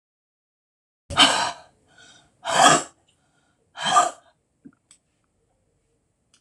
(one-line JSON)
{"exhalation_length": "6.4 s", "exhalation_amplitude": 26028, "exhalation_signal_mean_std_ratio": 0.3, "survey_phase": "alpha (2021-03-01 to 2021-08-12)", "age": "65+", "gender": "Female", "wearing_mask": "No", "symptom_none": true, "smoker_status": "Ex-smoker", "respiratory_condition_asthma": false, "respiratory_condition_other": false, "recruitment_source": "REACT", "submission_delay": "2 days", "covid_test_result": "Negative", "covid_test_method": "RT-qPCR"}